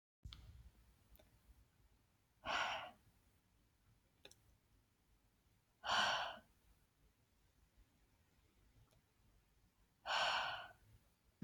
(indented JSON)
{
  "exhalation_length": "11.4 s",
  "exhalation_amplitude": 1803,
  "exhalation_signal_mean_std_ratio": 0.33,
  "survey_phase": "alpha (2021-03-01 to 2021-08-12)",
  "age": "18-44",
  "gender": "Female",
  "wearing_mask": "No",
  "symptom_fatigue": true,
  "symptom_headache": true,
  "smoker_status": "Never smoked",
  "respiratory_condition_asthma": false,
  "respiratory_condition_other": false,
  "recruitment_source": "REACT",
  "submission_delay": "1 day",
  "covid_test_result": "Negative",
  "covid_test_method": "RT-qPCR"
}